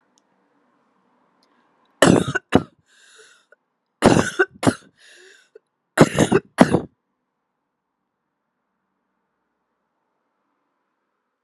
{"three_cough_length": "11.4 s", "three_cough_amplitude": 32768, "three_cough_signal_mean_std_ratio": 0.23, "survey_phase": "alpha (2021-03-01 to 2021-08-12)", "age": "18-44", "gender": "Female", "wearing_mask": "No", "symptom_cough_any": true, "symptom_shortness_of_breath": true, "symptom_fatigue": true, "symptom_onset": "2 days", "smoker_status": "Current smoker (e-cigarettes or vapes only)", "respiratory_condition_asthma": false, "respiratory_condition_other": false, "recruitment_source": "Test and Trace", "submission_delay": "2 days", "covid_test_result": "Positive", "covid_test_method": "RT-qPCR", "covid_ct_value": 30.0, "covid_ct_gene": "ORF1ab gene", "covid_ct_mean": 31.2, "covid_viral_load": "60 copies/ml", "covid_viral_load_category": "Minimal viral load (< 10K copies/ml)"}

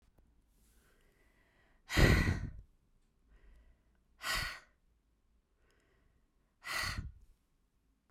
{"exhalation_length": "8.1 s", "exhalation_amplitude": 6552, "exhalation_signal_mean_std_ratio": 0.28, "survey_phase": "beta (2021-08-13 to 2022-03-07)", "age": "18-44", "gender": "Female", "wearing_mask": "No", "symptom_cough_any": true, "symptom_runny_or_blocked_nose": true, "symptom_shortness_of_breath": true, "symptom_sore_throat": true, "symptom_diarrhoea": true, "symptom_fatigue": true, "symptom_change_to_sense_of_smell_or_taste": true, "symptom_loss_of_taste": true, "symptom_other": true, "symptom_onset": "4 days", "smoker_status": "Never smoked", "respiratory_condition_asthma": false, "respiratory_condition_other": false, "recruitment_source": "Test and Trace", "submission_delay": "1 day", "covid_test_result": "Positive", "covid_test_method": "RT-qPCR", "covid_ct_value": 15.3, "covid_ct_gene": "N gene", "covid_ct_mean": 16.5, "covid_viral_load": "3800000 copies/ml", "covid_viral_load_category": "High viral load (>1M copies/ml)"}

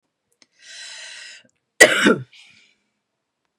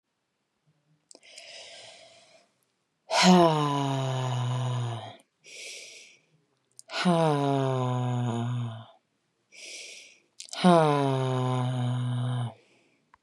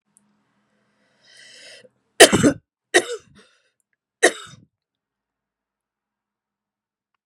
{"cough_length": "3.6 s", "cough_amplitude": 32768, "cough_signal_mean_std_ratio": 0.25, "exhalation_length": "13.2 s", "exhalation_amplitude": 16408, "exhalation_signal_mean_std_ratio": 0.54, "three_cough_length": "7.3 s", "three_cough_amplitude": 32768, "three_cough_signal_mean_std_ratio": 0.19, "survey_phase": "beta (2021-08-13 to 2022-03-07)", "age": "45-64", "gender": "Female", "wearing_mask": "No", "symptom_none": true, "symptom_onset": "3 days", "smoker_status": "Ex-smoker", "respiratory_condition_asthma": false, "respiratory_condition_other": false, "recruitment_source": "REACT", "submission_delay": "13 days", "covid_test_result": "Negative", "covid_test_method": "RT-qPCR", "influenza_a_test_result": "Negative", "influenza_b_test_result": "Negative"}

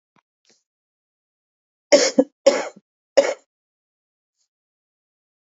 {"three_cough_length": "5.5 s", "three_cough_amplitude": 28606, "three_cough_signal_mean_std_ratio": 0.22, "survey_phase": "beta (2021-08-13 to 2022-03-07)", "age": "45-64", "gender": "Female", "wearing_mask": "No", "symptom_none": true, "smoker_status": "Current smoker (1 to 10 cigarettes per day)", "respiratory_condition_asthma": false, "respiratory_condition_other": false, "recruitment_source": "REACT", "submission_delay": "1 day", "covid_test_result": "Negative", "covid_test_method": "RT-qPCR"}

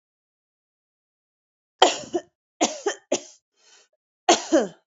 {"cough_length": "4.9 s", "cough_amplitude": 27194, "cough_signal_mean_std_ratio": 0.28, "survey_phase": "beta (2021-08-13 to 2022-03-07)", "age": "45-64", "gender": "Female", "wearing_mask": "No", "symptom_cough_any": true, "smoker_status": "Never smoked", "respiratory_condition_asthma": false, "respiratory_condition_other": false, "recruitment_source": "REACT", "submission_delay": "3 days", "covid_test_result": "Negative", "covid_test_method": "RT-qPCR"}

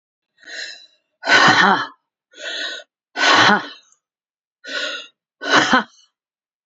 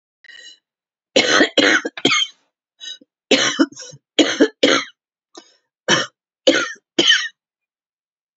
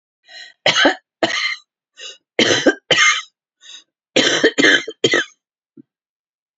{"exhalation_length": "6.7 s", "exhalation_amplitude": 32744, "exhalation_signal_mean_std_ratio": 0.42, "three_cough_length": "8.4 s", "three_cough_amplitude": 31374, "three_cough_signal_mean_std_ratio": 0.42, "cough_length": "6.6 s", "cough_amplitude": 32767, "cough_signal_mean_std_ratio": 0.45, "survey_phase": "alpha (2021-03-01 to 2021-08-12)", "age": "65+", "gender": "Female", "wearing_mask": "No", "symptom_cough_any": true, "symptom_fatigue": true, "symptom_change_to_sense_of_smell_or_taste": true, "symptom_onset": "9 days", "smoker_status": "Never smoked", "respiratory_condition_asthma": false, "respiratory_condition_other": false, "recruitment_source": "Test and Trace", "submission_delay": "1 day", "covid_test_result": "Positive", "covid_test_method": "RT-qPCR", "covid_ct_value": 21.4, "covid_ct_gene": "ORF1ab gene", "covid_ct_mean": 22.3, "covid_viral_load": "48000 copies/ml", "covid_viral_load_category": "Low viral load (10K-1M copies/ml)"}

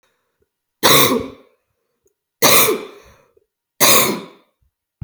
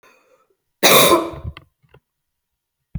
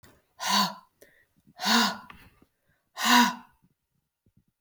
{"three_cough_length": "5.0 s", "three_cough_amplitude": 32768, "three_cough_signal_mean_std_ratio": 0.39, "cough_length": "3.0 s", "cough_amplitude": 32768, "cough_signal_mean_std_ratio": 0.32, "exhalation_length": "4.6 s", "exhalation_amplitude": 13641, "exhalation_signal_mean_std_ratio": 0.36, "survey_phase": "beta (2021-08-13 to 2022-03-07)", "age": "18-44", "gender": "Female", "wearing_mask": "No", "symptom_none": true, "smoker_status": "Never smoked", "respiratory_condition_asthma": false, "respiratory_condition_other": false, "recruitment_source": "REACT", "submission_delay": "1 day", "covid_test_result": "Negative", "covid_test_method": "RT-qPCR", "influenza_a_test_result": "Negative", "influenza_b_test_result": "Negative"}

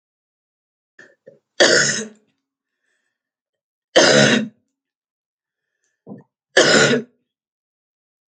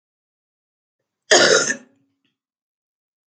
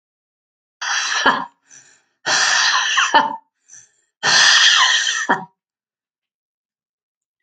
{"three_cough_length": "8.3 s", "three_cough_amplitude": 32768, "three_cough_signal_mean_std_ratio": 0.33, "cough_length": "3.3 s", "cough_amplitude": 31768, "cough_signal_mean_std_ratio": 0.27, "exhalation_length": "7.4 s", "exhalation_amplitude": 32711, "exhalation_signal_mean_std_ratio": 0.5, "survey_phase": "alpha (2021-03-01 to 2021-08-12)", "age": "45-64", "gender": "Female", "wearing_mask": "No", "symptom_cough_any": true, "symptom_headache": true, "symptom_change_to_sense_of_smell_or_taste": true, "symptom_loss_of_taste": true, "symptom_onset": "6 days", "smoker_status": "Never smoked", "respiratory_condition_asthma": false, "respiratory_condition_other": false, "recruitment_source": "Test and Trace", "submission_delay": "2 days", "covid_test_result": "Positive", "covid_test_method": "RT-qPCR", "covid_ct_value": 16.6, "covid_ct_gene": "ORF1ab gene", "covid_ct_mean": 17.5, "covid_viral_load": "1800000 copies/ml", "covid_viral_load_category": "High viral load (>1M copies/ml)"}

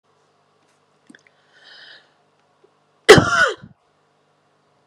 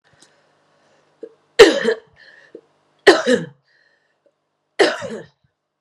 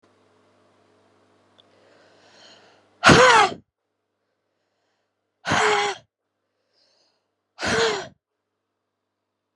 {"cough_length": "4.9 s", "cough_amplitude": 32768, "cough_signal_mean_std_ratio": 0.21, "three_cough_length": "5.8 s", "three_cough_amplitude": 32768, "three_cough_signal_mean_std_ratio": 0.27, "exhalation_length": "9.6 s", "exhalation_amplitude": 32637, "exhalation_signal_mean_std_ratio": 0.28, "survey_phase": "beta (2021-08-13 to 2022-03-07)", "age": "45-64", "gender": "Female", "wearing_mask": "No", "symptom_cough_any": true, "symptom_runny_or_blocked_nose": true, "symptom_sore_throat": true, "symptom_fatigue": true, "symptom_headache": true, "symptom_change_to_sense_of_smell_or_taste": true, "smoker_status": "Ex-smoker", "respiratory_condition_asthma": false, "respiratory_condition_other": false, "recruitment_source": "Test and Trace", "submission_delay": "3 days", "covid_test_result": "Positive", "covid_test_method": "RT-qPCR", "covid_ct_value": 15.5, "covid_ct_gene": "ORF1ab gene", "covid_ct_mean": 15.8, "covid_viral_load": "6600000 copies/ml", "covid_viral_load_category": "High viral load (>1M copies/ml)"}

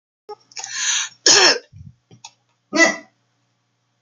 {"cough_length": "4.0 s", "cough_amplitude": 29318, "cough_signal_mean_std_ratio": 0.36, "survey_phase": "beta (2021-08-13 to 2022-03-07)", "age": "45-64", "gender": "Female", "wearing_mask": "No", "symptom_sore_throat": true, "smoker_status": "Never smoked", "respiratory_condition_asthma": false, "respiratory_condition_other": false, "recruitment_source": "Test and Trace", "submission_delay": "2 days", "covid_test_result": "Positive", "covid_test_method": "RT-qPCR", "covid_ct_value": 37.5, "covid_ct_gene": "N gene"}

